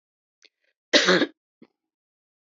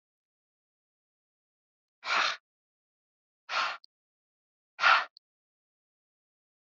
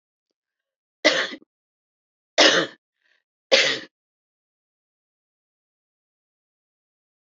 cough_length: 2.5 s
cough_amplitude: 29298
cough_signal_mean_std_ratio: 0.27
exhalation_length: 6.7 s
exhalation_amplitude: 11315
exhalation_signal_mean_std_ratio: 0.24
three_cough_length: 7.3 s
three_cough_amplitude: 26588
three_cough_signal_mean_std_ratio: 0.24
survey_phase: beta (2021-08-13 to 2022-03-07)
age: 65+
gender: Female
wearing_mask: 'No'
symptom_cough_any: true
symptom_shortness_of_breath: true
smoker_status: Never smoked
respiratory_condition_asthma: false
respiratory_condition_other: false
recruitment_source: REACT
submission_delay: 2 days
covid_test_result: Negative
covid_test_method: RT-qPCR
influenza_a_test_result: Negative
influenza_b_test_result: Negative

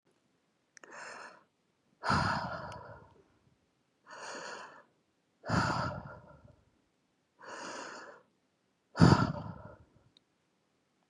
exhalation_length: 11.1 s
exhalation_amplitude: 11728
exhalation_signal_mean_std_ratio: 0.31
survey_phase: beta (2021-08-13 to 2022-03-07)
age: 45-64
gender: Female
wearing_mask: 'No'
symptom_cough_any: true
symptom_new_continuous_cough: true
symptom_runny_or_blocked_nose: true
symptom_sore_throat: true
symptom_fatigue: true
symptom_fever_high_temperature: true
symptom_headache: true
symptom_change_to_sense_of_smell_or_taste: true
symptom_loss_of_taste: true
symptom_onset: 9 days
smoker_status: Ex-smoker
respiratory_condition_asthma: false
respiratory_condition_other: false
recruitment_source: Test and Trace
submission_delay: 2 days
covid_test_result: Positive
covid_test_method: RT-qPCR
covid_ct_value: 18.9
covid_ct_gene: ORF1ab gene
covid_ct_mean: 20.2
covid_viral_load: 230000 copies/ml
covid_viral_load_category: Low viral load (10K-1M copies/ml)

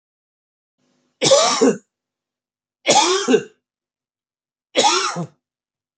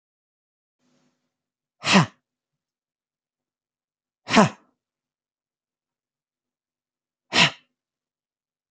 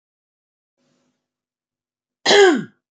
three_cough_length: 6.0 s
three_cough_amplitude: 27855
three_cough_signal_mean_std_ratio: 0.4
exhalation_length: 8.7 s
exhalation_amplitude: 27646
exhalation_signal_mean_std_ratio: 0.19
cough_length: 2.9 s
cough_amplitude: 29288
cough_signal_mean_std_ratio: 0.28
survey_phase: beta (2021-08-13 to 2022-03-07)
age: 18-44
gender: Female
wearing_mask: 'No'
symptom_none: true
symptom_onset: 5 days
smoker_status: Never smoked
respiratory_condition_asthma: false
respiratory_condition_other: false
recruitment_source: REACT
submission_delay: 4 days
covid_test_result: Negative
covid_test_method: RT-qPCR
influenza_a_test_result: Negative
influenza_b_test_result: Negative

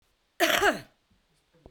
cough_length: 1.7 s
cough_amplitude: 13772
cough_signal_mean_std_ratio: 0.36
survey_phase: beta (2021-08-13 to 2022-03-07)
age: 45-64
gender: Female
wearing_mask: 'No'
symptom_none: true
smoker_status: Current smoker (1 to 10 cigarettes per day)
respiratory_condition_asthma: false
respiratory_condition_other: false
recruitment_source: REACT
submission_delay: 0 days
covid_test_result: Negative
covid_test_method: RT-qPCR
influenza_a_test_result: Negative
influenza_b_test_result: Negative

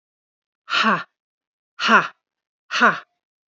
exhalation_length: 3.5 s
exhalation_amplitude: 27680
exhalation_signal_mean_std_ratio: 0.35
survey_phase: beta (2021-08-13 to 2022-03-07)
age: 18-44
gender: Female
wearing_mask: 'No'
symptom_none: true
smoker_status: Never smoked
respiratory_condition_asthma: false
respiratory_condition_other: false
recruitment_source: Test and Trace
submission_delay: 2 days
covid_test_result: Negative
covid_test_method: RT-qPCR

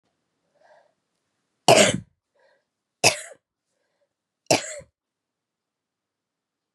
three_cough_length: 6.7 s
three_cough_amplitude: 31241
three_cough_signal_mean_std_ratio: 0.21
survey_phase: beta (2021-08-13 to 2022-03-07)
age: 45-64
gender: Female
wearing_mask: 'No'
symptom_cough_any: true
symptom_new_continuous_cough: true
symptom_runny_or_blocked_nose: true
symptom_sore_throat: true
symptom_fatigue: true
symptom_fever_high_temperature: true
symptom_change_to_sense_of_smell_or_taste: true
symptom_loss_of_taste: true
symptom_other: true
symptom_onset: 3 days
smoker_status: Never smoked
respiratory_condition_asthma: false
respiratory_condition_other: false
recruitment_source: Test and Trace
submission_delay: 1 day
covid_test_result: Positive
covid_test_method: LAMP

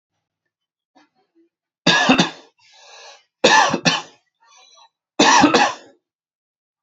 three_cough_length: 6.8 s
three_cough_amplitude: 32767
three_cough_signal_mean_std_ratio: 0.37
survey_phase: beta (2021-08-13 to 2022-03-07)
age: 18-44
gender: Male
wearing_mask: 'No'
symptom_fatigue: true
smoker_status: Never smoked
respiratory_condition_asthma: false
respiratory_condition_other: false
recruitment_source: REACT
submission_delay: 1 day
covid_test_result: Negative
covid_test_method: RT-qPCR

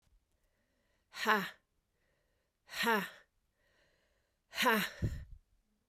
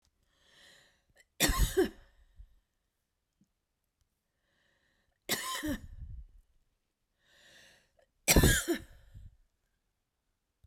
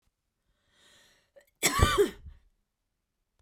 exhalation_length: 5.9 s
exhalation_amplitude: 6694
exhalation_signal_mean_std_ratio: 0.35
three_cough_length: 10.7 s
three_cough_amplitude: 11637
three_cough_signal_mean_std_ratio: 0.28
cough_length: 3.4 s
cough_amplitude: 13204
cough_signal_mean_std_ratio: 0.29
survey_phase: beta (2021-08-13 to 2022-03-07)
age: 45-64
gender: Female
wearing_mask: 'No'
symptom_cough_any: true
symptom_runny_or_blocked_nose: true
smoker_status: Ex-smoker
respiratory_condition_asthma: true
respiratory_condition_other: false
recruitment_source: Test and Trace
submission_delay: 1 day
covid_test_result: Negative
covid_test_method: RT-qPCR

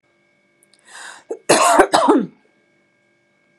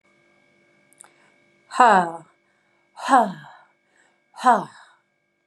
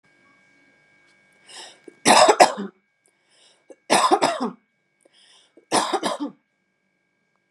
cough_length: 3.6 s
cough_amplitude: 32767
cough_signal_mean_std_ratio: 0.38
exhalation_length: 5.5 s
exhalation_amplitude: 30656
exhalation_signal_mean_std_ratio: 0.28
three_cough_length: 7.5 s
three_cough_amplitude: 32767
three_cough_signal_mean_std_ratio: 0.32
survey_phase: beta (2021-08-13 to 2022-03-07)
age: 45-64
gender: Female
wearing_mask: 'No'
symptom_none: true
smoker_status: Never smoked
respiratory_condition_asthma: true
respiratory_condition_other: false
recruitment_source: REACT
submission_delay: 1 day
covid_test_result: Negative
covid_test_method: RT-qPCR
influenza_a_test_result: Negative
influenza_b_test_result: Negative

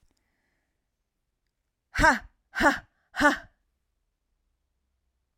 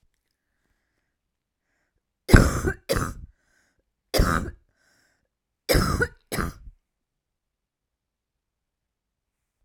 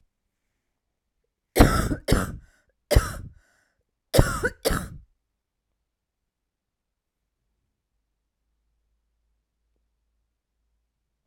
exhalation_length: 5.4 s
exhalation_amplitude: 15056
exhalation_signal_mean_std_ratio: 0.25
three_cough_length: 9.6 s
three_cough_amplitude: 32767
three_cough_signal_mean_std_ratio: 0.26
cough_length: 11.3 s
cough_amplitude: 32768
cough_signal_mean_std_ratio: 0.23
survey_phase: alpha (2021-03-01 to 2021-08-12)
age: 18-44
gender: Female
wearing_mask: 'No'
symptom_cough_any: true
symptom_shortness_of_breath: true
symptom_fatigue: true
symptom_fever_high_temperature: true
symptom_headache: true
smoker_status: Ex-smoker
respiratory_condition_asthma: false
respiratory_condition_other: false
recruitment_source: Test and Trace
submission_delay: 2 days
covid_test_result: Positive
covid_test_method: RT-qPCR
covid_ct_value: 33.7
covid_ct_gene: ORF1ab gene
covid_ct_mean: 33.7
covid_viral_load: 8.7 copies/ml
covid_viral_load_category: Minimal viral load (< 10K copies/ml)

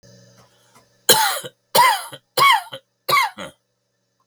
three_cough_length: 4.3 s
three_cough_amplitude: 32768
three_cough_signal_mean_std_ratio: 0.41
survey_phase: beta (2021-08-13 to 2022-03-07)
age: 65+
gender: Male
wearing_mask: 'No'
symptom_cough_any: true
symptom_runny_or_blocked_nose: true
symptom_shortness_of_breath: true
symptom_sore_throat: true
symptom_fatigue: true
symptom_other: true
symptom_onset: 5 days
smoker_status: Ex-smoker
respiratory_condition_asthma: true
respiratory_condition_other: false
recruitment_source: Test and Trace
submission_delay: 2 days
covid_test_result: Positive
covid_test_method: RT-qPCR
covid_ct_value: 25.6
covid_ct_gene: N gene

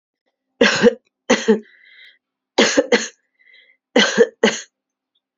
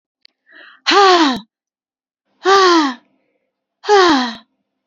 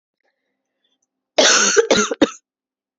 three_cough_length: 5.4 s
three_cough_amplitude: 32767
three_cough_signal_mean_std_ratio: 0.38
exhalation_length: 4.9 s
exhalation_amplitude: 30655
exhalation_signal_mean_std_ratio: 0.46
cough_length: 3.0 s
cough_amplitude: 31535
cough_signal_mean_std_ratio: 0.4
survey_phase: beta (2021-08-13 to 2022-03-07)
age: 45-64
gender: Male
wearing_mask: 'No'
symptom_cough_any: true
symptom_runny_or_blocked_nose: true
symptom_sore_throat: true
symptom_abdominal_pain: true
symptom_diarrhoea: true
symptom_fever_high_temperature: true
symptom_headache: true
symptom_onset: 6 days
smoker_status: Ex-smoker
respiratory_condition_asthma: true
respiratory_condition_other: false
recruitment_source: Test and Trace
submission_delay: 2 days
covid_test_result: Positive
covid_test_method: RT-qPCR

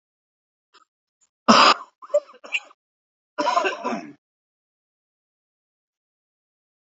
cough_length: 7.0 s
cough_amplitude: 31036
cough_signal_mean_std_ratio: 0.26
survey_phase: alpha (2021-03-01 to 2021-08-12)
age: 45-64
gender: Male
wearing_mask: 'No'
symptom_cough_any: true
symptom_fatigue: true
symptom_headache: true
symptom_onset: 2 days
smoker_status: Never smoked
respiratory_condition_asthma: true
respiratory_condition_other: false
recruitment_source: Test and Trace
submission_delay: 1 day
covid_test_result: Positive
covid_test_method: RT-qPCR
covid_ct_value: 15.9
covid_ct_gene: ORF1ab gene
covid_ct_mean: 16.4
covid_viral_load: 4300000 copies/ml
covid_viral_load_category: High viral load (>1M copies/ml)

